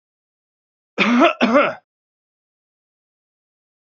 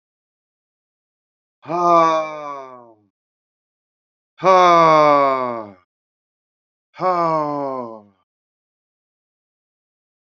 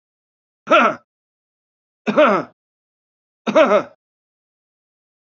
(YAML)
cough_length: 3.9 s
cough_amplitude: 32767
cough_signal_mean_std_ratio: 0.33
exhalation_length: 10.3 s
exhalation_amplitude: 28036
exhalation_signal_mean_std_ratio: 0.37
three_cough_length: 5.3 s
three_cough_amplitude: 31283
three_cough_signal_mean_std_ratio: 0.32
survey_phase: beta (2021-08-13 to 2022-03-07)
age: 65+
gender: Male
wearing_mask: 'No'
symptom_none: true
smoker_status: Current smoker (e-cigarettes or vapes only)
respiratory_condition_asthma: false
respiratory_condition_other: false
recruitment_source: REACT
submission_delay: 1 day
covid_test_result: Negative
covid_test_method: RT-qPCR
influenza_a_test_result: Negative
influenza_b_test_result: Negative